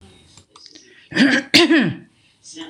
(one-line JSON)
{"cough_length": "2.7 s", "cough_amplitude": 26028, "cough_signal_mean_std_ratio": 0.44, "survey_phase": "beta (2021-08-13 to 2022-03-07)", "age": "65+", "gender": "Female", "wearing_mask": "No", "symptom_fatigue": true, "symptom_onset": "8 days", "smoker_status": "Ex-smoker", "respiratory_condition_asthma": false, "respiratory_condition_other": false, "recruitment_source": "REACT", "submission_delay": "2 days", "covid_test_result": "Negative", "covid_test_method": "RT-qPCR", "influenza_a_test_result": "Unknown/Void", "influenza_b_test_result": "Unknown/Void"}